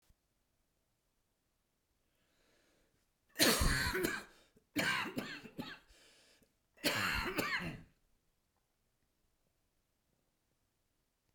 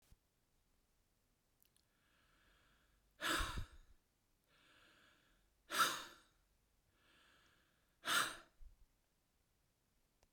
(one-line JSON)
{"cough_length": "11.3 s", "cough_amplitude": 6784, "cough_signal_mean_std_ratio": 0.36, "exhalation_length": "10.3 s", "exhalation_amplitude": 2630, "exhalation_signal_mean_std_ratio": 0.27, "survey_phase": "beta (2021-08-13 to 2022-03-07)", "age": "45-64", "gender": "Male", "wearing_mask": "No", "symptom_cough_any": true, "symptom_shortness_of_breath": true, "symptom_fatigue": true, "symptom_other": true, "smoker_status": "Never smoked", "respiratory_condition_asthma": false, "respiratory_condition_other": false, "recruitment_source": "Test and Trace", "submission_delay": "2 days", "covid_test_result": "Positive", "covid_test_method": "RT-qPCR", "covid_ct_value": 27.5, "covid_ct_gene": "ORF1ab gene", "covid_ct_mean": 28.4, "covid_viral_load": "480 copies/ml", "covid_viral_load_category": "Minimal viral load (< 10K copies/ml)"}